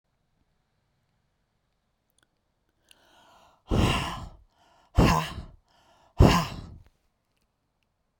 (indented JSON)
{
  "exhalation_length": "8.2 s",
  "exhalation_amplitude": 22646,
  "exhalation_signal_mean_std_ratio": 0.27,
  "survey_phase": "beta (2021-08-13 to 2022-03-07)",
  "age": "65+",
  "gender": "Female",
  "wearing_mask": "No",
  "symptom_cough_any": true,
  "symptom_runny_or_blocked_nose": true,
  "symptom_sore_throat": true,
  "symptom_fatigue": true,
  "smoker_status": "Ex-smoker",
  "respiratory_condition_asthma": false,
  "respiratory_condition_other": false,
  "recruitment_source": "Test and Trace",
  "submission_delay": "2 days",
  "covid_test_result": "Positive",
  "covid_test_method": "RT-qPCR"
}